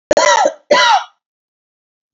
cough_length: 2.1 s
cough_amplitude: 29975
cough_signal_mean_std_ratio: 0.5
survey_phase: alpha (2021-03-01 to 2021-08-12)
age: 45-64
gender: Female
wearing_mask: 'No'
symptom_cough_any: true
symptom_fatigue: true
symptom_change_to_sense_of_smell_or_taste: true
symptom_loss_of_taste: true
smoker_status: Never smoked
respiratory_condition_asthma: false
respiratory_condition_other: false
recruitment_source: Test and Trace
submission_delay: 2 days
covid_test_result: Positive
covid_test_method: RT-qPCR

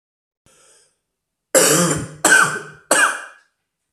three_cough_length: 3.9 s
three_cough_amplitude: 32767
three_cough_signal_mean_std_ratio: 0.44
survey_phase: beta (2021-08-13 to 2022-03-07)
age: 18-44
gender: Male
wearing_mask: 'No'
symptom_cough_any: true
symptom_runny_or_blocked_nose: true
symptom_fatigue: true
symptom_headache: true
symptom_other: true
symptom_onset: 4 days
smoker_status: Never smoked
respiratory_condition_asthma: false
respiratory_condition_other: false
recruitment_source: Test and Trace
submission_delay: 2 days
covid_test_result: Positive
covid_test_method: RT-qPCR
covid_ct_value: 16.4
covid_ct_gene: ORF1ab gene
covid_ct_mean: 17.0
covid_viral_load: 2700000 copies/ml
covid_viral_load_category: High viral load (>1M copies/ml)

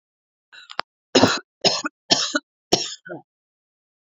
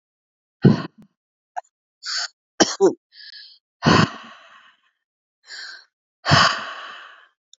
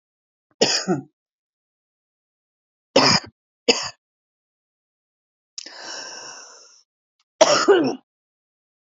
cough_length: 4.2 s
cough_amplitude: 30360
cough_signal_mean_std_ratio: 0.32
exhalation_length: 7.6 s
exhalation_amplitude: 32365
exhalation_signal_mean_std_ratio: 0.32
three_cough_length: 9.0 s
three_cough_amplitude: 28375
three_cough_signal_mean_std_ratio: 0.3
survey_phase: beta (2021-08-13 to 2022-03-07)
age: 18-44
gender: Female
wearing_mask: 'No'
symptom_cough_any: true
symptom_shortness_of_breath: true
symptom_sore_throat: true
symptom_fatigue: true
symptom_headache: true
symptom_other: true
symptom_onset: 3 days
smoker_status: Never smoked
respiratory_condition_asthma: true
respiratory_condition_other: false
recruitment_source: Test and Trace
submission_delay: 1 day
covid_test_result: Positive
covid_test_method: ePCR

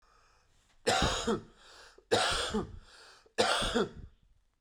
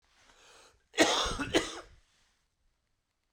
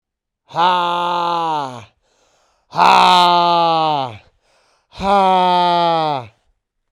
three_cough_length: 4.6 s
three_cough_amplitude: 7666
three_cough_signal_mean_std_ratio: 0.52
cough_length: 3.3 s
cough_amplitude: 9382
cough_signal_mean_std_ratio: 0.34
exhalation_length: 6.9 s
exhalation_amplitude: 32768
exhalation_signal_mean_std_ratio: 0.64
survey_phase: beta (2021-08-13 to 2022-03-07)
age: 18-44
gender: Male
wearing_mask: 'No'
symptom_cough_any: true
symptom_shortness_of_breath: true
symptom_sore_throat: true
symptom_fatigue: true
symptom_onset: 4 days
smoker_status: Never smoked
respiratory_condition_asthma: true
respiratory_condition_other: false
recruitment_source: REACT
submission_delay: 2 days
covid_test_result: Negative
covid_test_method: RT-qPCR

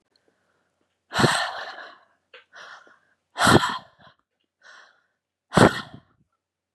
exhalation_length: 6.7 s
exhalation_amplitude: 32201
exhalation_signal_mean_std_ratio: 0.28
survey_phase: beta (2021-08-13 to 2022-03-07)
age: 45-64
gender: Female
wearing_mask: 'No'
symptom_none: true
smoker_status: Never smoked
respiratory_condition_asthma: false
respiratory_condition_other: false
recruitment_source: REACT
submission_delay: 4 days
covid_test_result: Negative
covid_test_method: RT-qPCR
influenza_a_test_result: Negative
influenza_b_test_result: Negative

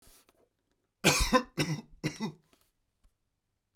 three_cough_length: 3.8 s
three_cough_amplitude: 11426
three_cough_signal_mean_std_ratio: 0.33
survey_phase: beta (2021-08-13 to 2022-03-07)
age: 65+
gender: Male
wearing_mask: 'No'
symptom_none: true
smoker_status: Ex-smoker
respiratory_condition_asthma: false
respiratory_condition_other: false
recruitment_source: REACT
submission_delay: 2 days
covid_test_result: Negative
covid_test_method: RT-qPCR
influenza_a_test_result: Unknown/Void
influenza_b_test_result: Unknown/Void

